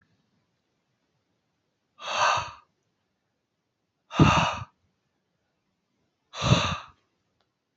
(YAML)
exhalation_length: 7.8 s
exhalation_amplitude: 22206
exhalation_signal_mean_std_ratio: 0.29
survey_phase: beta (2021-08-13 to 2022-03-07)
age: 18-44
gender: Male
wearing_mask: 'No'
symptom_none: true
smoker_status: Never smoked
respiratory_condition_asthma: false
respiratory_condition_other: false
recruitment_source: REACT
submission_delay: 1 day
covid_test_result: Negative
covid_test_method: RT-qPCR
influenza_a_test_result: Negative
influenza_b_test_result: Negative